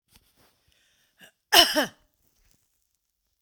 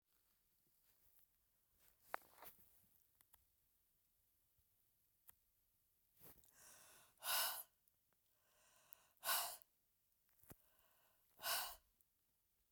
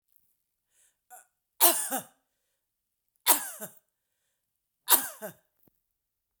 {"cough_length": "3.4 s", "cough_amplitude": 26939, "cough_signal_mean_std_ratio": 0.22, "exhalation_length": "12.7 s", "exhalation_amplitude": 1807, "exhalation_signal_mean_std_ratio": 0.27, "three_cough_length": "6.4 s", "three_cough_amplitude": 20166, "three_cough_signal_mean_std_ratio": 0.23, "survey_phase": "beta (2021-08-13 to 2022-03-07)", "age": "45-64", "gender": "Female", "wearing_mask": "No", "symptom_none": true, "smoker_status": "Never smoked", "respiratory_condition_asthma": false, "respiratory_condition_other": false, "recruitment_source": "REACT", "submission_delay": "2 days", "covid_test_result": "Negative", "covid_test_method": "RT-qPCR", "influenza_a_test_result": "Negative", "influenza_b_test_result": "Negative"}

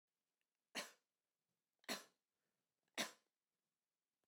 {"three_cough_length": "4.3 s", "three_cough_amplitude": 1269, "three_cough_signal_mean_std_ratio": 0.22, "survey_phase": "beta (2021-08-13 to 2022-03-07)", "age": "45-64", "gender": "Female", "wearing_mask": "No", "symptom_none": true, "smoker_status": "Never smoked", "respiratory_condition_asthma": false, "respiratory_condition_other": false, "recruitment_source": "REACT", "submission_delay": "2 days", "covid_test_result": "Negative", "covid_test_method": "RT-qPCR"}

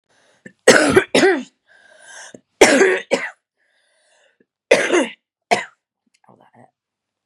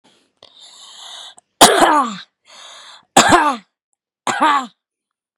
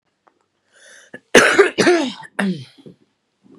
{"three_cough_length": "7.3 s", "three_cough_amplitude": 32768, "three_cough_signal_mean_std_ratio": 0.36, "exhalation_length": "5.4 s", "exhalation_amplitude": 32768, "exhalation_signal_mean_std_ratio": 0.38, "cough_length": "3.6 s", "cough_amplitude": 32768, "cough_signal_mean_std_ratio": 0.38, "survey_phase": "beta (2021-08-13 to 2022-03-07)", "age": "18-44", "gender": "Female", "wearing_mask": "No", "symptom_cough_any": true, "symptom_runny_or_blocked_nose": true, "symptom_sore_throat": true, "symptom_onset": "6 days", "smoker_status": "Never smoked", "respiratory_condition_asthma": false, "respiratory_condition_other": false, "recruitment_source": "REACT", "submission_delay": "1 day", "covid_test_result": "Negative", "covid_test_method": "RT-qPCR"}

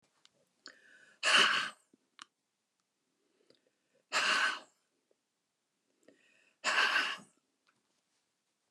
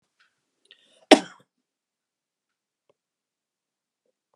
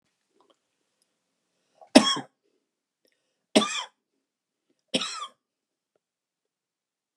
{"exhalation_length": "8.7 s", "exhalation_amplitude": 7826, "exhalation_signal_mean_std_ratio": 0.32, "cough_length": "4.4 s", "cough_amplitude": 32767, "cough_signal_mean_std_ratio": 0.09, "three_cough_length": "7.2 s", "three_cough_amplitude": 32767, "three_cough_signal_mean_std_ratio": 0.18, "survey_phase": "beta (2021-08-13 to 2022-03-07)", "age": "65+", "gender": "Male", "wearing_mask": "No", "symptom_none": true, "smoker_status": "Never smoked", "respiratory_condition_asthma": true, "respiratory_condition_other": false, "recruitment_source": "REACT", "submission_delay": "2 days", "covid_test_result": "Negative", "covid_test_method": "RT-qPCR", "influenza_a_test_result": "Unknown/Void", "influenza_b_test_result": "Unknown/Void"}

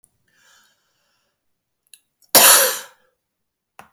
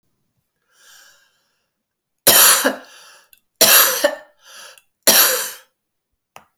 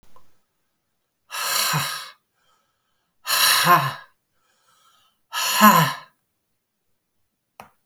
{"cough_length": "3.9 s", "cough_amplitude": 32768, "cough_signal_mean_std_ratio": 0.25, "three_cough_length": "6.6 s", "three_cough_amplitude": 32768, "three_cough_signal_mean_std_ratio": 0.36, "exhalation_length": "7.9 s", "exhalation_amplitude": 29108, "exhalation_signal_mean_std_ratio": 0.37, "survey_phase": "beta (2021-08-13 to 2022-03-07)", "age": "65+", "gender": "Female", "wearing_mask": "No", "symptom_cough_any": true, "symptom_runny_or_blocked_nose": true, "symptom_sore_throat": true, "symptom_fatigue": true, "symptom_headache": true, "symptom_loss_of_taste": true, "symptom_onset": "4 days", "smoker_status": "Ex-smoker", "respiratory_condition_asthma": false, "respiratory_condition_other": false, "recruitment_source": "Test and Trace", "submission_delay": "2 days", "covid_test_result": "Positive", "covid_test_method": "RT-qPCR", "covid_ct_value": 12.3, "covid_ct_gene": "ORF1ab gene", "covid_ct_mean": 12.8, "covid_viral_load": "64000000 copies/ml", "covid_viral_load_category": "High viral load (>1M copies/ml)"}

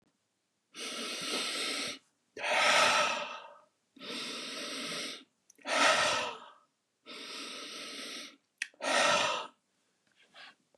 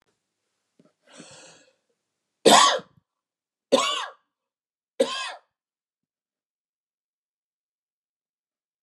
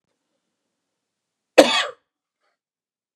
{"exhalation_length": "10.8 s", "exhalation_amplitude": 7417, "exhalation_signal_mean_std_ratio": 0.53, "three_cough_length": "8.8 s", "three_cough_amplitude": 27232, "three_cough_signal_mean_std_ratio": 0.22, "cough_length": "3.2 s", "cough_amplitude": 32768, "cough_signal_mean_std_ratio": 0.19, "survey_phase": "beta (2021-08-13 to 2022-03-07)", "age": "45-64", "gender": "Male", "wearing_mask": "No", "symptom_none": true, "smoker_status": "Never smoked", "respiratory_condition_asthma": false, "respiratory_condition_other": false, "recruitment_source": "REACT", "submission_delay": "1 day", "covid_test_result": "Negative", "covid_test_method": "RT-qPCR", "influenza_a_test_result": "Negative", "influenza_b_test_result": "Negative"}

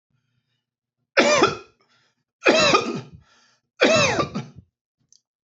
{"three_cough_length": "5.5 s", "three_cough_amplitude": 30929, "three_cough_signal_mean_std_ratio": 0.41, "survey_phase": "beta (2021-08-13 to 2022-03-07)", "age": "45-64", "gender": "Male", "wearing_mask": "No", "symptom_none": true, "smoker_status": "Ex-smoker", "respiratory_condition_asthma": false, "respiratory_condition_other": false, "recruitment_source": "REACT", "submission_delay": "3 days", "covid_test_result": "Negative", "covid_test_method": "RT-qPCR"}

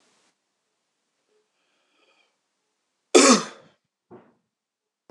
{"cough_length": "5.1 s", "cough_amplitude": 25967, "cough_signal_mean_std_ratio": 0.19, "survey_phase": "beta (2021-08-13 to 2022-03-07)", "age": "45-64", "gender": "Male", "wearing_mask": "No", "symptom_cough_any": true, "symptom_runny_or_blocked_nose": true, "symptom_change_to_sense_of_smell_or_taste": true, "symptom_loss_of_taste": true, "symptom_onset": "4 days", "smoker_status": "Ex-smoker", "respiratory_condition_asthma": false, "respiratory_condition_other": false, "recruitment_source": "Test and Trace", "submission_delay": "2 days", "covid_test_result": "Positive", "covid_test_method": "RT-qPCR"}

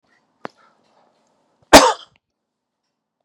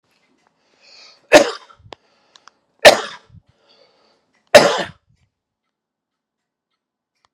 {"cough_length": "3.2 s", "cough_amplitude": 32768, "cough_signal_mean_std_ratio": 0.19, "three_cough_length": "7.3 s", "three_cough_amplitude": 32768, "three_cough_signal_mean_std_ratio": 0.21, "survey_phase": "beta (2021-08-13 to 2022-03-07)", "age": "45-64", "gender": "Male", "wearing_mask": "No", "symptom_none": true, "smoker_status": "Current smoker (11 or more cigarettes per day)", "respiratory_condition_asthma": false, "respiratory_condition_other": false, "recruitment_source": "REACT", "submission_delay": "0 days", "covid_test_result": "Negative", "covid_test_method": "RT-qPCR", "influenza_a_test_result": "Negative", "influenza_b_test_result": "Negative"}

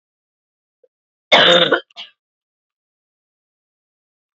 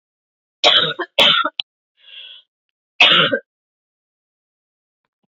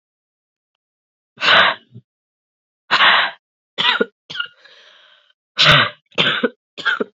{"cough_length": "4.4 s", "cough_amplitude": 30507, "cough_signal_mean_std_ratio": 0.26, "three_cough_length": "5.3 s", "three_cough_amplitude": 32768, "three_cough_signal_mean_std_ratio": 0.35, "exhalation_length": "7.2 s", "exhalation_amplitude": 30786, "exhalation_signal_mean_std_ratio": 0.4, "survey_phase": "beta (2021-08-13 to 2022-03-07)", "age": "18-44", "gender": "Female", "wearing_mask": "No", "symptom_cough_any": true, "symptom_runny_or_blocked_nose": true, "symptom_sore_throat": true, "symptom_fatigue": true, "symptom_headache": true, "symptom_change_to_sense_of_smell_or_taste": true, "symptom_other": true, "smoker_status": "Never smoked", "respiratory_condition_asthma": false, "respiratory_condition_other": false, "recruitment_source": "Test and Trace", "submission_delay": "1 day", "covid_test_result": "Positive", "covid_test_method": "LFT"}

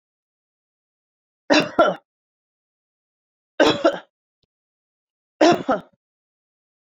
{"three_cough_length": "6.9 s", "three_cough_amplitude": 25303, "three_cough_signal_mean_std_ratio": 0.27, "survey_phase": "beta (2021-08-13 to 2022-03-07)", "age": "65+", "gender": "Female", "wearing_mask": "No", "symptom_none": true, "smoker_status": "Ex-smoker", "respiratory_condition_asthma": false, "respiratory_condition_other": false, "recruitment_source": "REACT", "submission_delay": "9 days", "covid_test_result": "Negative", "covid_test_method": "RT-qPCR"}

